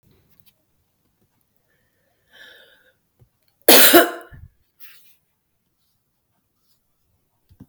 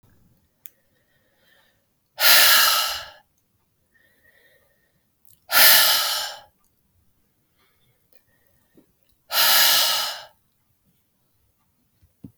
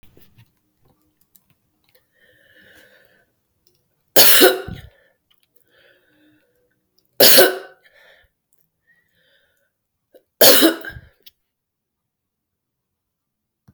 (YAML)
cough_length: 7.7 s
cough_amplitude: 32768
cough_signal_mean_std_ratio: 0.2
exhalation_length: 12.4 s
exhalation_amplitude: 31725
exhalation_signal_mean_std_ratio: 0.34
three_cough_length: 13.7 s
three_cough_amplitude: 32768
three_cough_signal_mean_std_ratio: 0.24
survey_phase: beta (2021-08-13 to 2022-03-07)
age: 45-64
gender: Female
wearing_mask: 'No'
symptom_runny_or_blocked_nose: true
symptom_onset: 10 days
smoker_status: Never smoked
respiratory_condition_asthma: false
respiratory_condition_other: false
recruitment_source: REACT
submission_delay: 1 day
covid_test_result: Negative
covid_test_method: RT-qPCR
influenza_a_test_result: Negative
influenza_b_test_result: Negative